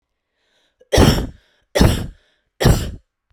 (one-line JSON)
{"three_cough_length": "3.3 s", "three_cough_amplitude": 32768, "three_cough_signal_mean_std_ratio": 0.4, "survey_phase": "beta (2021-08-13 to 2022-03-07)", "age": "18-44", "gender": "Female", "wearing_mask": "No", "symptom_none": true, "smoker_status": "Current smoker (e-cigarettes or vapes only)", "respiratory_condition_asthma": false, "respiratory_condition_other": false, "recruitment_source": "REACT", "submission_delay": "3 days", "covid_test_result": "Negative", "covid_test_method": "RT-qPCR"}